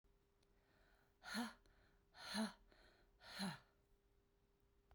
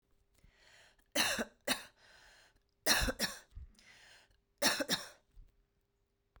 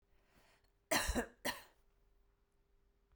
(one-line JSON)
{"exhalation_length": "4.9 s", "exhalation_amplitude": 732, "exhalation_signal_mean_std_ratio": 0.38, "three_cough_length": "6.4 s", "three_cough_amplitude": 5724, "three_cough_signal_mean_std_ratio": 0.36, "cough_length": "3.2 s", "cough_amplitude": 3100, "cough_signal_mean_std_ratio": 0.31, "survey_phase": "beta (2021-08-13 to 2022-03-07)", "age": "45-64", "gender": "Female", "wearing_mask": "No", "symptom_cough_any": true, "symptom_runny_or_blocked_nose": true, "symptom_onset": "4 days", "smoker_status": "Never smoked", "respiratory_condition_asthma": false, "respiratory_condition_other": false, "recruitment_source": "Test and Trace", "submission_delay": "1 day", "covid_test_result": "Positive", "covid_test_method": "RT-qPCR", "covid_ct_value": 17.5, "covid_ct_gene": "ORF1ab gene"}